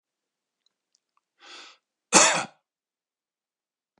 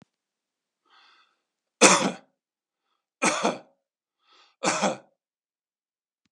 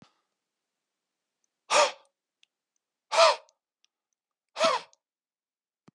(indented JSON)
{
  "cough_length": "4.0 s",
  "cough_amplitude": 29323,
  "cough_signal_mean_std_ratio": 0.21,
  "three_cough_length": "6.3 s",
  "three_cough_amplitude": 31211,
  "three_cough_signal_mean_std_ratio": 0.26,
  "exhalation_length": "5.9 s",
  "exhalation_amplitude": 16649,
  "exhalation_signal_mean_std_ratio": 0.25,
  "survey_phase": "beta (2021-08-13 to 2022-03-07)",
  "age": "45-64",
  "gender": "Male",
  "wearing_mask": "No",
  "symptom_none": true,
  "smoker_status": "Never smoked",
  "respiratory_condition_asthma": false,
  "respiratory_condition_other": false,
  "recruitment_source": "REACT",
  "submission_delay": "1 day",
  "covid_test_result": "Negative",
  "covid_test_method": "RT-qPCR"
}